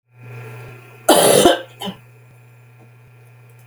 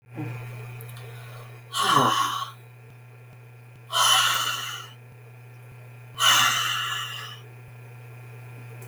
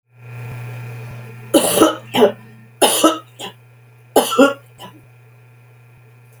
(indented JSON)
{
  "cough_length": "3.7 s",
  "cough_amplitude": 32768,
  "cough_signal_mean_std_ratio": 0.37,
  "exhalation_length": "8.9 s",
  "exhalation_amplitude": 17071,
  "exhalation_signal_mean_std_ratio": 0.56,
  "three_cough_length": "6.4 s",
  "three_cough_amplitude": 32768,
  "three_cough_signal_mean_std_ratio": 0.42,
  "survey_phase": "beta (2021-08-13 to 2022-03-07)",
  "age": "65+",
  "gender": "Female",
  "wearing_mask": "No",
  "symptom_none": true,
  "smoker_status": "Never smoked",
  "respiratory_condition_asthma": false,
  "respiratory_condition_other": false,
  "recruitment_source": "REACT",
  "submission_delay": "1 day",
  "covid_test_result": "Negative",
  "covid_test_method": "RT-qPCR",
  "influenza_a_test_result": "Negative",
  "influenza_b_test_result": "Negative"
}